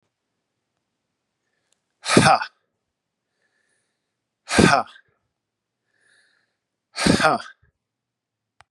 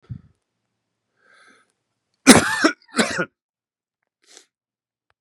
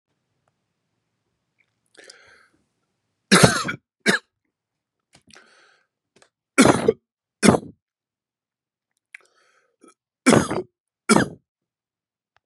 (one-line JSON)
{"exhalation_length": "8.7 s", "exhalation_amplitude": 32768, "exhalation_signal_mean_std_ratio": 0.26, "cough_length": "5.2 s", "cough_amplitude": 32768, "cough_signal_mean_std_ratio": 0.23, "three_cough_length": "12.5 s", "three_cough_amplitude": 32767, "three_cough_signal_mean_std_ratio": 0.24, "survey_phase": "beta (2021-08-13 to 2022-03-07)", "age": "45-64", "gender": "Male", "wearing_mask": "No", "symptom_headache": true, "smoker_status": "Never smoked", "respiratory_condition_asthma": false, "respiratory_condition_other": false, "recruitment_source": "Test and Trace", "submission_delay": "2 days", "covid_test_result": "Positive", "covid_test_method": "RT-qPCR", "covid_ct_value": 14.8, "covid_ct_gene": "N gene", "covid_ct_mean": 14.8, "covid_viral_load": "14000000 copies/ml", "covid_viral_load_category": "High viral load (>1M copies/ml)"}